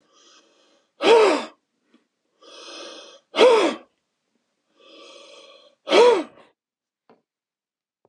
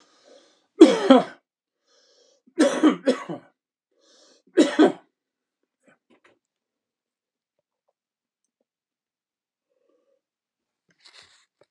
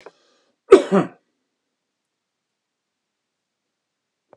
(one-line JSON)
{"exhalation_length": "8.1 s", "exhalation_amplitude": 24916, "exhalation_signal_mean_std_ratio": 0.32, "three_cough_length": "11.7 s", "three_cough_amplitude": 32767, "three_cough_signal_mean_std_ratio": 0.22, "cough_length": "4.4 s", "cough_amplitude": 32768, "cough_signal_mean_std_ratio": 0.16, "survey_phase": "beta (2021-08-13 to 2022-03-07)", "age": "45-64", "gender": "Female", "wearing_mask": "No", "symptom_cough_any": true, "symptom_fatigue": true, "smoker_status": "Ex-smoker", "respiratory_condition_asthma": false, "respiratory_condition_other": true, "recruitment_source": "Test and Trace", "submission_delay": "3 days", "covid_test_result": "Positive", "covid_test_method": "RT-qPCR", "covid_ct_value": 18.9, "covid_ct_gene": "ORF1ab gene"}